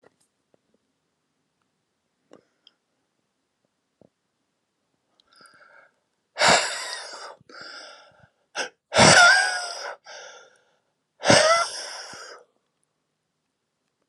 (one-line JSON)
{"exhalation_length": "14.1 s", "exhalation_amplitude": 28876, "exhalation_signal_mean_std_ratio": 0.28, "survey_phase": "alpha (2021-03-01 to 2021-08-12)", "age": "45-64", "gender": "Male", "wearing_mask": "No", "symptom_cough_any": true, "symptom_shortness_of_breath": true, "symptom_fatigue": true, "smoker_status": "Ex-smoker", "respiratory_condition_asthma": false, "respiratory_condition_other": true, "recruitment_source": "REACT", "submission_delay": "2 days", "covid_test_result": "Negative", "covid_test_method": "RT-qPCR"}